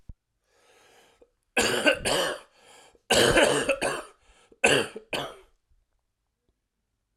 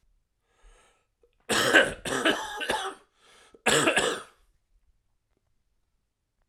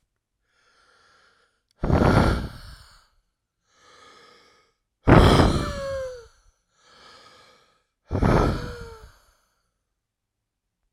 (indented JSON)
{
  "three_cough_length": "7.2 s",
  "three_cough_amplitude": 18641,
  "three_cough_signal_mean_std_ratio": 0.41,
  "cough_length": "6.5 s",
  "cough_amplitude": 19508,
  "cough_signal_mean_std_ratio": 0.38,
  "exhalation_length": "10.9 s",
  "exhalation_amplitude": 32767,
  "exhalation_signal_mean_std_ratio": 0.33,
  "survey_phase": "alpha (2021-03-01 to 2021-08-12)",
  "age": "18-44",
  "gender": "Male",
  "wearing_mask": "No",
  "symptom_cough_any": true,
  "symptom_shortness_of_breath": true,
  "symptom_fatigue": true,
  "symptom_fever_high_temperature": true,
  "symptom_headache": true,
  "symptom_change_to_sense_of_smell_or_taste": true,
  "smoker_status": "Ex-smoker",
  "respiratory_condition_asthma": false,
  "respiratory_condition_other": false,
  "recruitment_source": "Test and Trace",
  "submission_delay": "1 day",
  "covid_test_result": "Positive",
  "covid_test_method": "RT-qPCR",
  "covid_ct_value": 15.5,
  "covid_ct_gene": "N gene",
  "covid_ct_mean": 15.6,
  "covid_viral_load": "7700000 copies/ml",
  "covid_viral_load_category": "High viral load (>1M copies/ml)"
}